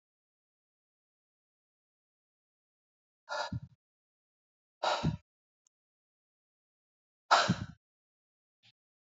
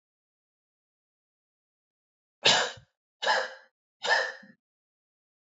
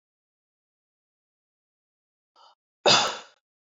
{"exhalation_length": "9.0 s", "exhalation_amplitude": 12331, "exhalation_signal_mean_std_ratio": 0.21, "three_cough_length": "5.5 s", "three_cough_amplitude": 15407, "three_cough_signal_mean_std_ratio": 0.29, "cough_length": "3.7 s", "cough_amplitude": 16002, "cough_signal_mean_std_ratio": 0.21, "survey_phase": "beta (2021-08-13 to 2022-03-07)", "age": "18-44", "gender": "Male", "wearing_mask": "No", "symptom_none": true, "smoker_status": "Ex-smoker", "respiratory_condition_asthma": false, "respiratory_condition_other": false, "recruitment_source": "REACT", "submission_delay": "3 days", "covid_test_result": "Negative", "covid_test_method": "RT-qPCR", "influenza_a_test_result": "Negative", "influenza_b_test_result": "Negative"}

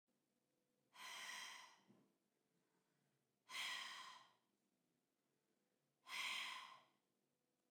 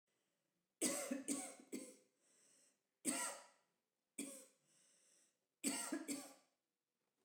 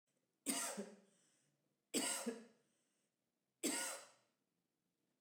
{"exhalation_length": "7.7 s", "exhalation_amplitude": 568, "exhalation_signal_mean_std_ratio": 0.43, "cough_length": "7.2 s", "cough_amplitude": 1442, "cough_signal_mean_std_ratio": 0.42, "three_cough_length": "5.2 s", "three_cough_amplitude": 1793, "three_cough_signal_mean_std_ratio": 0.4, "survey_phase": "beta (2021-08-13 to 2022-03-07)", "age": "45-64", "gender": "Female", "wearing_mask": "No", "symptom_cough_any": true, "smoker_status": "Ex-smoker", "respiratory_condition_asthma": false, "respiratory_condition_other": false, "recruitment_source": "REACT", "submission_delay": "1 day", "covid_test_result": "Negative", "covid_test_method": "RT-qPCR", "influenza_a_test_result": "Unknown/Void", "influenza_b_test_result": "Unknown/Void"}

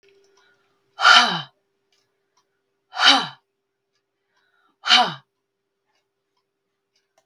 {"exhalation_length": "7.3 s", "exhalation_amplitude": 32768, "exhalation_signal_mean_std_ratio": 0.26, "survey_phase": "beta (2021-08-13 to 2022-03-07)", "age": "45-64", "gender": "Female", "wearing_mask": "No", "symptom_none": true, "smoker_status": "Never smoked", "respiratory_condition_asthma": false, "respiratory_condition_other": false, "recruitment_source": "REACT", "submission_delay": "1 day", "covid_test_result": "Negative", "covid_test_method": "RT-qPCR"}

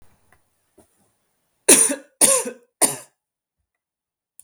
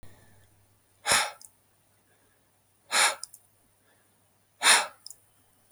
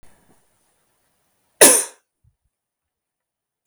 {"three_cough_length": "4.4 s", "three_cough_amplitude": 32768, "three_cough_signal_mean_std_ratio": 0.28, "exhalation_length": "5.7 s", "exhalation_amplitude": 16243, "exhalation_signal_mean_std_ratio": 0.28, "cough_length": "3.7 s", "cough_amplitude": 32768, "cough_signal_mean_std_ratio": 0.19, "survey_phase": "beta (2021-08-13 to 2022-03-07)", "age": "18-44", "gender": "Female", "wearing_mask": "No", "symptom_none": true, "smoker_status": "Never smoked", "respiratory_condition_asthma": false, "respiratory_condition_other": false, "recruitment_source": "REACT", "submission_delay": "1 day", "covid_test_result": "Negative", "covid_test_method": "RT-qPCR", "influenza_a_test_result": "Negative", "influenza_b_test_result": "Negative"}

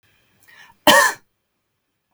{"cough_length": "2.1 s", "cough_amplitude": 32768, "cough_signal_mean_std_ratio": 0.28, "survey_phase": "beta (2021-08-13 to 2022-03-07)", "age": "45-64", "gender": "Female", "wearing_mask": "No", "symptom_none": true, "smoker_status": "Never smoked", "respiratory_condition_asthma": false, "respiratory_condition_other": false, "recruitment_source": "REACT", "submission_delay": "2 days", "covid_test_result": "Negative", "covid_test_method": "RT-qPCR", "influenza_a_test_result": "Negative", "influenza_b_test_result": "Negative"}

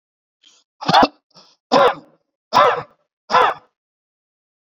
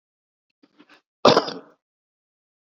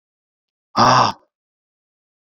{"three_cough_length": "4.6 s", "three_cough_amplitude": 29699, "three_cough_signal_mean_std_ratio": 0.36, "cough_length": "2.7 s", "cough_amplitude": 28674, "cough_signal_mean_std_ratio": 0.2, "exhalation_length": "2.3 s", "exhalation_amplitude": 28940, "exhalation_signal_mean_std_ratio": 0.31, "survey_phase": "beta (2021-08-13 to 2022-03-07)", "age": "45-64", "gender": "Male", "wearing_mask": "No", "symptom_none": true, "smoker_status": "Ex-smoker", "respiratory_condition_asthma": false, "respiratory_condition_other": false, "recruitment_source": "REACT", "submission_delay": "5 days", "covid_test_result": "Negative", "covid_test_method": "RT-qPCR"}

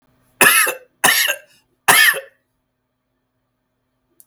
{"three_cough_length": "4.3 s", "three_cough_amplitude": 32768, "three_cough_signal_mean_std_ratio": 0.38, "survey_phase": "beta (2021-08-13 to 2022-03-07)", "age": "18-44", "gender": "Male", "wearing_mask": "No", "symptom_diarrhoea": true, "symptom_fatigue": true, "smoker_status": "Never smoked", "respiratory_condition_asthma": false, "respiratory_condition_other": false, "recruitment_source": "REACT", "submission_delay": "1 day", "covid_test_result": "Negative", "covid_test_method": "RT-qPCR"}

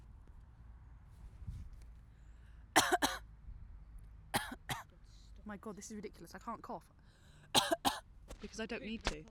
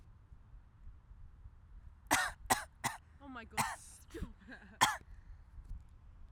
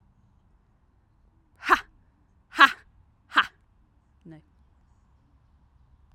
{"three_cough_length": "9.3 s", "three_cough_amplitude": 8533, "three_cough_signal_mean_std_ratio": 0.43, "cough_length": "6.3 s", "cough_amplitude": 7685, "cough_signal_mean_std_ratio": 0.4, "exhalation_length": "6.1 s", "exhalation_amplitude": 29495, "exhalation_signal_mean_std_ratio": 0.17, "survey_phase": "alpha (2021-03-01 to 2021-08-12)", "age": "18-44", "gender": "Female", "wearing_mask": "No", "symptom_cough_any": true, "symptom_shortness_of_breath": true, "symptom_abdominal_pain": true, "symptom_fatigue": true, "symptom_headache": true, "symptom_change_to_sense_of_smell_or_taste": true, "symptom_onset": "3 days", "smoker_status": "Never smoked", "respiratory_condition_asthma": false, "respiratory_condition_other": false, "recruitment_source": "Test and Trace", "submission_delay": "2 days", "covid_test_result": "Positive", "covid_test_method": "RT-qPCR"}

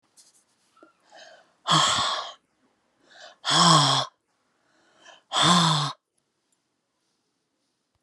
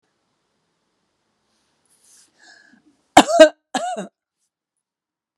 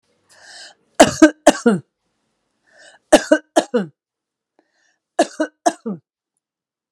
{"exhalation_length": "8.0 s", "exhalation_amplitude": 22188, "exhalation_signal_mean_std_ratio": 0.38, "cough_length": "5.4 s", "cough_amplitude": 32768, "cough_signal_mean_std_ratio": 0.19, "three_cough_length": "6.9 s", "three_cough_amplitude": 32768, "three_cough_signal_mean_std_ratio": 0.26, "survey_phase": "beta (2021-08-13 to 2022-03-07)", "age": "65+", "gender": "Female", "wearing_mask": "No", "symptom_none": true, "smoker_status": "Ex-smoker", "respiratory_condition_asthma": false, "respiratory_condition_other": false, "recruitment_source": "REACT", "submission_delay": "3 days", "covid_test_result": "Negative", "covid_test_method": "RT-qPCR"}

